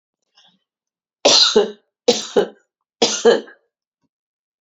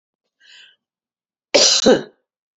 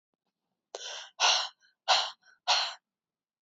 {"three_cough_length": "4.6 s", "three_cough_amplitude": 30675, "three_cough_signal_mean_std_ratio": 0.36, "cough_length": "2.6 s", "cough_amplitude": 32767, "cough_signal_mean_std_ratio": 0.33, "exhalation_length": "3.4 s", "exhalation_amplitude": 9898, "exhalation_signal_mean_std_ratio": 0.38, "survey_phase": "beta (2021-08-13 to 2022-03-07)", "age": "65+", "gender": "Female", "wearing_mask": "No", "symptom_cough_any": true, "symptom_runny_or_blocked_nose": true, "symptom_shortness_of_breath": true, "symptom_fatigue": true, "symptom_fever_high_temperature": true, "symptom_headache": true, "symptom_onset": "2 days", "smoker_status": "Ex-smoker", "respiratory_condition_asthma": false, "respiratory_condition_other": false, "recruitment_source": "Test and Trace", "submission_delay": "1 day", "covid_test_result": "Positive", "covid_test_method": "RT-qPCR", "covid_ct_value": 28.5, "covid_ct_gene": "N gene"}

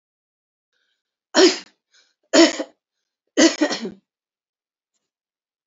{"three_cough_length": "5.7 s", "three_cough_amplitude": 28596, "three_cough_signal_mean_std_ratio": 0.28, "survey_phase": "beta (2021-08-13 to 2022-03-07)", "age": "65+", "gender": "Female", "wearing_mask": "No", "symptom_cough_any": true, "symptom_onset": "12 days", "smoker_status": "Never smoked", "respiratory_condition_asthma": true, "respiratory_condition_other": false, "recruitment_source": "REACT", "submission_delay": "5 days", "covid_test_result": "Negative", "covid_test_method": "RT-qPCR"}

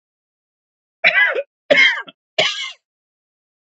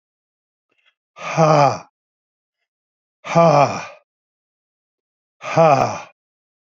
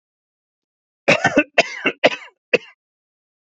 {"three_cough_length": "3.7 s", "three_cough_amplitude": 27979, "three_cough_signal_mean_std_ratio": 0.38, "exhalation_length": "6.7 s", "exhalation_amplitude": 32209, "exhalation_signal_mean_std_ratio": 0.35, "cough_length": "3.4 s", "cough_amplitude": 28288, "cough_signal_mean_std_ratio": 0.31, "survey_phase": "beta (2021-08-13 to 2022-03-07)", "age": "45-64", "gender": "Male", "wearing_mask": "No", "symptom_cough_any": true, "symptom_shortness_of_breath": true, "symptom_fatigue": true, "symptom_onset": "2 days", "smoker_status": "Never smoked", "respiratory_condition_asthma": false, "respiratory_condition_other": false, "recruitment_source": "Test and Trace", "submission_delay": "2 days", "covid_test_result": "Positive", "covid_test_method": "RT-qPCR", "covid_ct_value": 26.7, "covid_ct_gene": "ORF1ab gene", "covid_ct_mean": 28.0, "covid_viral_load": "640 copies/ml", "covid_viral_load_category": "Minimal viral load (< 10K copies/ml)"}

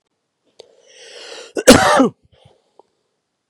{"cough_length": "3.5 s", "cough_amplitude": 32768, "cough_signal_mean_std_ratio": 0.29, "survey_phase": "beta (2021-08-13 to 2022-03-07)", "age": "18-44", "gender": "Male", "wearing_mask": "No", "symptom_none": true, "smoker_status": "Ex-smoker", "respiratory_condition_asthma": false, "respiratory_condition_other": false, "recruitment_source": "REACT", "submission_delay": "2 days", "covid_test_result": "Negative", "covid_test_method": "RT-qPCR", "influenza_a_test_result": "Negative", "influenza_b_test_result": "Negative"}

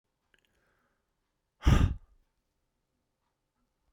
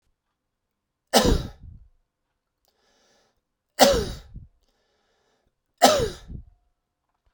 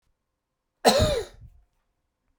{"exhalation_length": "3.9 s", "exhalation_amplitude": 9131, "exhalation_signal_mean_std_ratio": 0.21, "three_cough_length": "7.3 s", "three_cough_amplitude": 31576, "three_cough_signal_mean_std_ratio": 0.27, "cough_length": "2.4 s", "cough_amplitude": 21897, "cough_signal_mean_std_ratio": 0.32, "survey_phase": "beta (2021-08-13 to 2022-03-07)", "age": "45-64", "gender": "Male", "wearing_mask": "No", "symptom_cough_any": true, "symptom_sore_throat": true, "symptom_fatigue": true, "smoker_status": "Ex-smoker", "respiratory_condition_asthma": false, "respiratory_condition_other": false, "recruitment_source": "Test and Trace", "submission_delay": "2 days", "covid_test_result": "Positive", "covid_test_method": "RT-qPCR"}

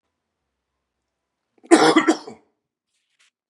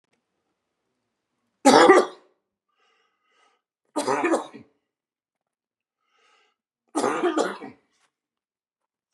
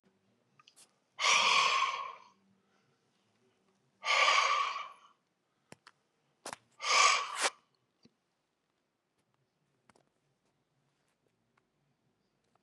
{"cough_length": "3.5 s", "cough_amplitude": 32736, "cough_signal_mean_std_ratio": 0.26, "three_cough_length": "9.1 s", "three_cough_amplitude": 30740, "three_cough_signal_mean_std_ratio": 0.27, "exhalation_length": "12.6 s", "exhalation_amplitude": 7246, "exhalation_signal_mean_std_ratio": 0.34, "survey_phase": "beta (2021-08-13 to 2022-03-07)", "age": "45-64", "gender": "Male", "wearing_mask": "No", "symptom_none": true, "smoker_status": "Never smoked", "respiratory_condition_asthma": false, "respiratory_condition_other": false, "recruitment_source": "REACT", "submission_delay": "1 day", "covid_test_result": "Negative", "covid_test_method": "RT-qPCR", "influenza_a_test_result": "Negative", "influenza_b_test_result": "Negative"}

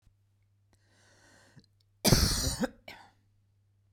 {"cough_length": "3.9 s", "cough_amplitude": 11511, "cough_signal_mean_std_ratio": 0.3, "survey_phase": "beta (2021-08-13 to 2022-03-07)", "age": "45-64", "gender": "Female", "wearing_mask": "No", "symptom_none": true, "symptom_onset": "8 days", "smoker_status": "Ex-smoker", "respiratory_condition_asthma": false, "respiratory_condition_other": false, "recruitment_source": "REACT", "submission_delay": "1 day", "covid_test_result": "Negative", "covid_test_method": "RT-qPCR"}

